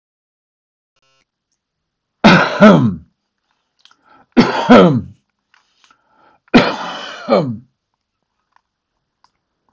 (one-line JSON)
{"three_cough_length": "9.7 s", "three_cough_amplitude": 32768, "three_cough_signal_mean_std_ratio": 0.33, "survey_phase": "beta (2021-08-13 to 2022-03-07)", "age": "65+", "gender": "Male", "wearing_mask": "No", "symptom_none": true, "smoker_status": "Ex-smoker", "respiratory_condition_asthma": false, "respiratory_condition_other": false, "recruitment_source": "REACT", "submission_delay": "4 days", "covid_test_result": "Negative", "covid_test_method": "RT-qPCR", "influenza_a_test_result": "Unknown/Void", "influenza_b_test_result": "Unknown/Void"}